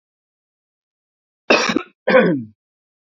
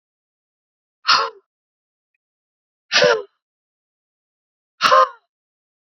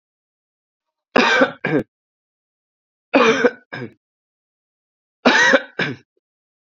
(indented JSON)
{
  "cough_length": "3.2 s",
  "cough_amplitude": 28659,
  "cough_signal_mean_std_ratio": 0.35,
  "exhalation_length": "5.9 s",
  "exhalation_amplitude": 28154,
  "exhalation_signal_mean_std_ratio": 0.28,
  "three_cough_length": "6.7 s",
  "three_cough_amplitude": 32767,
  "three_cough_signal_mean_std_ratio": 0.36,
  "survey_phase": "beta (2021-08-13 to 2022-03-07)",
  "age": "18-44",
  "gender": "Male",
  "wearing_mask": "No",
  "symptom_none": true,
  "symptom_onset": "3 days",
  "smoker_status": "Never smoked",
  "respiratory_condition_asthma": false,
  "respiratory_condition_other": false,
  "recruitment_source": "Test and Trace",
  "submission_delay": "2 days",
  "covid_test_result": "Positive",
  "covid_test_method": "RT-qPCR",
  "covid_ct_value": 22.0,
  "covid_ct_gene": "N gene"
}